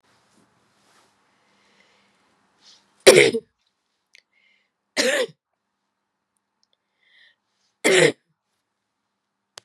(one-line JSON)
{"three_cough_length": "9.6 s", "three_cough_amplitude": 32768, "three_cough_signal_mean_std_ratio": 0.21, "survey_phase": "beta (2021-08-13 to 2022-03-07)", "age": "45-64", "gender": "Female", "wearing_mask": "No", "symptom_cough_any": true, "symptom_runny_or_blocked_nose": true, "symptom_sore_throat": true, "smoker_status": "Never smoked", "respiratory_condition_asthma": false, "respiratory_condition_other": false, "recruitment_source": "Test and Trace", "submission_delay": "2 days", "covid_test_result": "Positive", "covid_test_method": "RT-qPCR", "covid_ct_value": 23.6, "covid_ct_gene": "ORF1ab gene", "covid_ct_mean": 24.3, "covid_viral_load": "11000 copies/ml", "covid_viral_load_category": "Low viral load (10K-1M copies/ml)"}